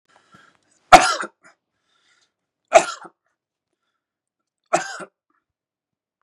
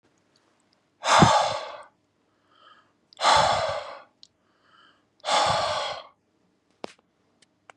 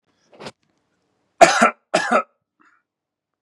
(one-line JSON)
{"three_cough_length": "6.2 s", "three_cough_amplitude": 32768, "three_cough_signal_mean_std_ratio": 0.18, "exhalation_length": "7.8 s", "exhalation_amplitude": 24056, "exhalation_signal_mean_std_ratio": 0.39, "cough_length": "3.4 s", "cough_amplitude": 32768, "cough_signal_mean_std_ratio": 0.28, "survey_phase": "beta (2021-08-13 to 2022-03-07)", "age": "45-64", "gender": "Male", "wearing_mask": "No", "symptom_none": true, "smoker_status": "Ex-smoker", "respiratory_condition_asthma": false, "respiratory_condition_other": false, "recruitment_source": "REACT", "submission_delay": "1 day", "covid_test_result": "Negative", "covid_test_method": "RT-qPCR", "influenza_a_test_result": "Negative", "influenza_b_test_result": "Negative"}